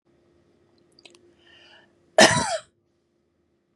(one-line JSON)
{"cough_length": "3.8 s", "cough_amplitude": 29570, "cough_signal_mean_std_ratio": 0.22, "survey_phase": "beta (2021-08-13 to 2022-03-07)", "age": "45-64", "gender": "Female", "wearing_mask": "No", "symptom_none": true, "smoker_status": "Never smoked", "respiratory_condition_asthma": false, "respiratory_condition_other": false, "recruitment_source": "REACT", "submission_delay": "2 days", "covid_test_result": "Negative", "covid_test_method": "RT-qPCR", "influenza_a_test_result": "Negative", "influenza_b_test_result": "Negative"}